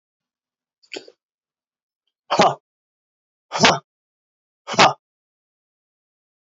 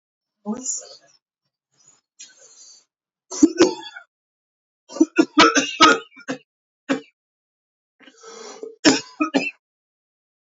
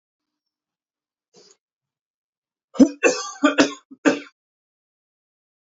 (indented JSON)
{
  "exhalation_length": "6.5 s",
  "exhalation_amplitude": 30948,
  "exhalation_signal_mean_std_ratio": 0.23,
  "three_cough_length": "10.5 s",
  "three_cough_amplitude": 29563,
  "three_cough_signal_mean_std_ratio": 0.3,
  "cough_length": "5.6 s",
  "cough_amplitude": 27488,
  "cough_signal_mean_std_ratio": 0.24,
  "survey_phase": "alpha (2021-03-01 to 2021-08-12)",
  "age": "45-64",
  "gender": "Male",
  "wearing_mask": "No",
  "symptom_cough_any": true,
  "symptom_abdominal_pain": true,
  "symptom_fatigue": true,
  "symptom_headache": true,
  "smoker_status": "Never smoked",
  "respiratory_condition_asthma": false,
  "respiratory_condition_other": false,
  "recruitment_source": "Test and Trace",
  "submission_delay": "1 day",
  "covid_test_result": "Positive",
  "covid_test_method": "RT-qPCR",
  "covid_ct_value": 21.0,
  "covid_ct_gene": "ORF1ab gene"
}